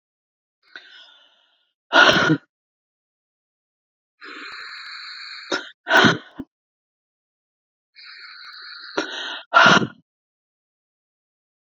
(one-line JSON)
{"exhalation_length": "11.7 s", "exhalation_amplitude": 32767, "exhalation_signal_mean_std_ratio": 0.29, "survey_phase": "beta (2021-08-13 to 2022-03-07)", "age": "45-64", "gender": "Female", "wearing_mask": "No", "symptom_cough_any": true, "symptom_new_continuous_cough": true, "symptom_runny_or_blocked_nose": true, "symptom_sore_throat": true, "symptom_fatigue": true, "symptom_fever_high_temperature": true, "symptom_headache": true, "symptom_onset": "2 days", "smoker_status": "Ex-smoker", "respiratory_condition_asthma": false, "respiratory_condition_other": false, "recruitment_source": "Test and Trace", "submission_delay": "2 days", "covid_test_result": "Positive", "covid_test_method": "RT-qPCR"}